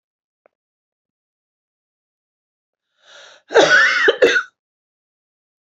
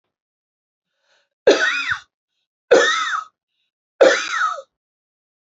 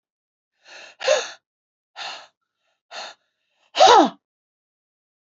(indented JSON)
{
  "cough_length": "5.6 s",
  "cough_amplitude": 27819,
  "cough_signal_mean_std_ratio": 0.31,
  "three_cough_length": "5.5 s",
  "three_cough_amplitude": 28297,
  "three_cough_signal_mean_std_ratio": 0.37,
  "exhalation_length": "5.4 s",
  "exhalation_amplitude": 32767,
  "exhalation_signal_mean_std_ratio": 0.26,
  "survey_phase": "beta (2021-08-13 to 2022-03-07)",
  "age": "45-64",
  "gender": "Female",
  "wearing_mask": "No",
  "symptom_runny_or_blocked_nose": true,
  "symptom_sore_throat": true,
  "symptom_headache": true,
  "smoker_status": "Ex-smoker",
  "respiratory_condition_asthma": true,
  "respiratory_condition_other": false,
  "recruitment_source": "Test and Trace",
  "submission_delay": "1 day",
  "covid_test_result": "Positive",
  "covid_test_method": "LFT"
}